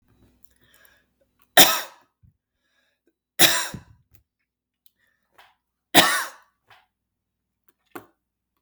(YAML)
three_cough_length: 8.6 s
three_cough_amplitude: 32768
three_cough_signal_mean_std_ratio: 0.21
survey_phase: beta (2021-08-13 to 2022-03-07)
age: 45-64
gender: Male
wearing_mask: 'No'
symptom_none: true
smoker_status: Ex-smoker
respiratory_condition_asthma: false
respiratory_condition_other: false
recruitment_source: Test and Trace
submission_delay: 2 days
covid_test_result: Positive
covid_test_method: ePCR